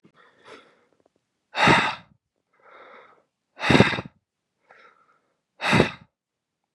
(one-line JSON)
{"exhalation_length": "6.7 s", "exhalation_amplitude": 31330, "exhalation_signal_mean_std_ratio": 0.29, "survey_phase": "beta (2021-08-13 to 2022-03-07)", "age": "18-44", "gender": "Male", "wearing_mask": "No", "symptom_runny_or_blocked_nose": true, "symptom_fatigue": true, "symptom_change_to_sense_of_smell_or_taste": true, "smoker_status": "Never smoked", "respiratory_condition_asthma": true, "respiratory_condition_other": false, "recruitment_source": "Test and Trace", "submission_delay": "1 day", "covid_test_result": "Positive", "covid_test_method": "RT-qPCR"}